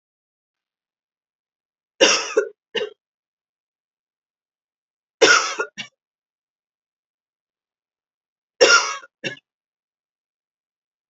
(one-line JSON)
{"three_cough_length": "11.1 s", "three_cough_amplitude": 30558, "three_cough_signal_mean_std_ratio": 0.24, "survey_phase": "beta (2021-08-13 to 2022-03-07)", "age": "45-64", "gender": "Female", "wearing_mask": "No", "symptom_cough_any": true, "symptom_runny_or_blocked_nose": true, "symptom_sore_throat": true, "symptom_fatigue": true, "symptom_headache": true, "symptom_other": true, "smoker_status": "Never smoked", "respiratory_condition_asthma": false, "respiratory_condition_other": false, "recruitment_source": "Test and Trace", "submission_delay": "1 day", "covid_test_result": "Positive", "covid_test_method": "RT-qPCR", "covid_ct_value": 23.4, "covid_ct_gene": "ORF1ab gene"}